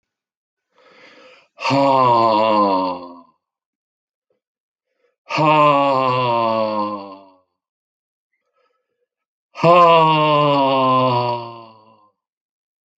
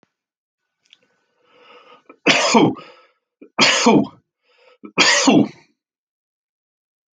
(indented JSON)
{
  "exhalation_length": "13.0 s",
  "exhalation_amplitude": 28223,
  "exhalation_signal_mean_std_ratio": 0.52,
  "three_cough_length": "7.2 s",
  "three_cough_amplitude": 30574,
  "three_cough_signal_mean_std_ratio": 0.37,
  "survey_phase": "alpha (2021-03-01 to 2021-08-12)",
  "age": "65+",
  "gender": "Male",
  "wearing_mask": "No",
  "symptom_none": true,
  "smoker_status": "Never smoked",
  "respiratory_condition_asthma": false,
  "respiratory_condition_other": false,
  "recruitment_source": "REACT",
  "submission_delay": "1 day",
  "covid_test_result": "Negative",
  "covid_test_method": "RT-qPCR"
}